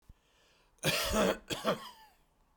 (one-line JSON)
{"cough_length": "2.6 s", "cough_amplitude": 6210, "cough_signal_mean_std_ratio": 0.47, "survey_phase": "beta (2021-08-13 to 2022-03-07)", "age": "65+", "gender": "Male", "wearing_mask": "No", "symptom_none": true, "smoker_status": "Ex-smoker", "respiratory_condition_asthma": false, "respiratory_condition_other": false, "recruitment_source": "REACT", "submission_delay": "3 days", "covid_test_result": "Negative", "covid_test_method": "RT-qPCR", "influenza_a_test_result": "Negative", "influenza_b_test_result": "Negative"}